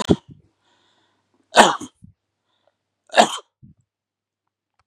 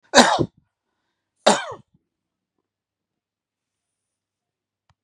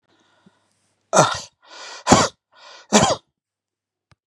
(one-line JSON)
{"three_cough_length": "4.9 s", "three_cough_amplitude": 32768, "three_cough_signal_mean_std_ratio": 0.22, "cough_length": "5.0 s", "cough_amplitude": 32768, "cough_signal_mean_std_ratio": 0.21, "exhalation_length": "4.3 s", "exhalation_amplitude": 32768, "exhalation_signal_mean_std_ratio": 0.31, "survey_phase": "beta (2021-08-13 to 2022-03-07)", "age": "65+", "gender": "Male", "wearing_mask": "No", "symptom_none": true, "smoker_status": "Never smoked", "respiratory_condition_asthma": false, "respiratory_condition_other": false, "recruitment_source": "Test and Trace", "submission_delay": "0 days", "covid_test_result": "Negative", "covid_test_method": "RT-qPCR"}